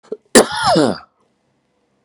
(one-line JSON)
{"cough_length": "2.0 s", "cough_amplitude": 32768, "cough_signal_mean_std_ratio": 0.38, "survey_phase": "beta (2021-08-13 to 2022-03-07)", "age": "65+", "gender": "Male", "wearing_mask": "No", "symptom_cough_any": true, "symptom_runny_or_blocked_nose": true, "symptom_diarrhoea": true, "symptom_fatigue": true, "symptom_fever_high_temperature": true, "symptom_headache": true, "symptom_onset": "3 days", "smoker_status": "Never smoked", "respiratory_condition_asthma": false, "respiratory_condition_other": false, "recruitment_source": "Test and Trace", "submission_delay": "2 days", "covid_test_result": "Positive", "covid_test_method": "RT-qPCR", "covid_ct_value": 15.6, "covid_ct_gene": "ORF1ab gene", "covid_ct_mean": 16.2, "covid_viral_load": "5000000 copies/ml", "covid_viral_load_category": "High viral load (>1M copies/ml)"}